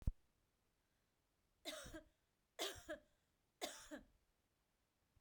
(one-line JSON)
{"three_cough_length": "5.2 s", "three_cough_amplitude": 1745, "three_cough_signal_mean_std_ratio": 0.29, "survey_phase": "beta (2021-08-13 to 2022-03-07)", "age": "45-64", "gender": "Female", "wearing_mask": "No", "symptom_none": true, "smoker_status": "Never smoked", "respiratory_condition_asthma": false, "respiratory_condition_other": false, "recruitment_source": "REACT", "submission_delay": "1 day", "covid_test_result": "Negative", "covid_test_method": "RT-qPCR"}